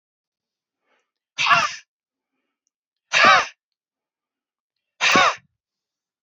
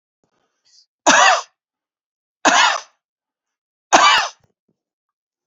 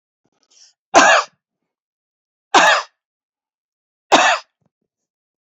{"exhalation_length": "6.2 s", "exhalation_amplitude": 28350, "exhalation_signal_mean_std_ratio": 0.31, "three_cough_length": "5.5 s", "three_cough_amplitude": 31084, "three_cough_signal_mean_std_ratio": 0.35, "cough_length": "5.5 s", "cough_amplitude": 31272, "cough_signal_mean_std_ratio": 0.31, "survey_phase": "beta (2021-08-13 to 2022-03-07)", "age": "65+", "gender": "Male", "wearing_mask": "No", "symptom_none": true, "smoker_status": "Never smoked", "respiratory_condition_asthma": false, "respiratory_condition_other": false, "recruitment_source": "REACT", "submission_delay": "2 days", "covid_test_result": "Negative", "covid_test_method": "RT-qPCR"}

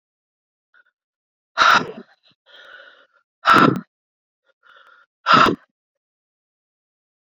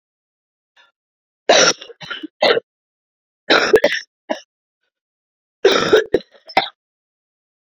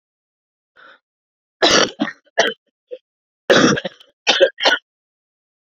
{"exhalation_length": "7.3 s", "exhalation_amplitude": 28142, "exhalation_signal_mean_std_ratio": 0.28, "three_cough_length": "7.8 s", "three_cough_amplitude": 31450, "three_cough_signal_mean_std_ratio": 0.33, "cough_length": "5.7 s", "cough_amplitude": 31717, "cough_signal_mean_std_ratio": 0.36, "survey_phase": "beta (2021-08-13 to 2022-03-07)", "age": "18-44", "gender": "Female", "wearing_mask": "No", "symptom_cough_any": true, "symptom_new_continuous_cough": true, "symptom_runny_or_blocked_nose": true, "symptom_sore_throat": true, "symptom_abdominal_pain": true, "symptom_fatigue": true, "symptom_fever_high_temperature": true, "symptom_headache": true, "smoker_status": "Never smoked", "respiratory_condition_asthma": false, "respiratory_condition_other": false, "recruitment_source": "Test and Trace", "submission_delay": "2 days", "covid_test_result": "Positive", "covid_test_method": "RT-qPCR", "covid_ct_value": 32.8, "covid_ct_gene": "ORF1ab gene"}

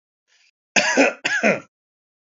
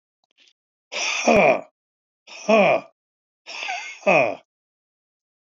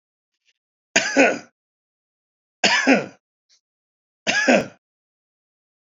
{"cough_length": "2.4 s", "cough_amplitude": 27801, "cough_signal_mean_std_ratio": 0.42, "exhalation_length": "5.5 s", "exhalation_amplitude": 20560, "exhalation_signal_mean_std_ratio": 0.4, "three_cough_length": "6.0 s", "three_cough_amplitude": 28689, "three_cough_signal_mean_std_ratio": 0.34, "survey_phase": "alpha (2021-03-01 to 2021-08-12)", "age": "65+", "gender": "Male", "wearing_mask": "No", "symptom_none": true, "smoker_status": "Never smoked", "respiratory_condition_asthma": false, "respiratory_condition_other": false, "recruitment_source": "REACT", "submission_delay": "1 day", "covid_test_result": "Negative", "covid_test_method": "RT-qPCR"}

